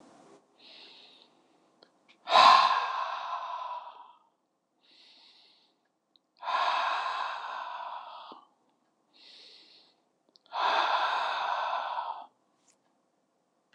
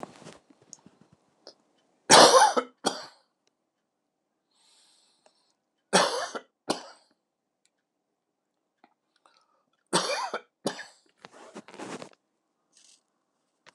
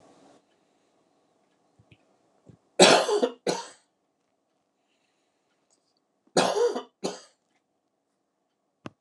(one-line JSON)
{"exhalation_length": "13.7 s", "exhalation_amplitude": 15820, "exhalation_signal_mean_std_ratio": 0.4, "three_cough_length": "13.7 s", "three_cough_amplitude": 29203, "three_cough_signal_mean_std_ratio": 0.23, "cough_length": "9.0 s", "cough_amplitude": 28059, "cough_signal_mean_std_ratio": 0.25, "survey_phase": "alpha (2021-03-01 to 2021-08-12)", "age": "65+", "gender": "Male", "wearing_mask": "No", "symptom_none": true, "smoker_status": "Never smoked", "respiratory_condition_asthma": false, "respiratory_condition_other": false, "recruitment_source": "REACT", "submission_delay": "2 days", "covid_test_result": "Negative", "covid_test_method": "RT-qPCR"}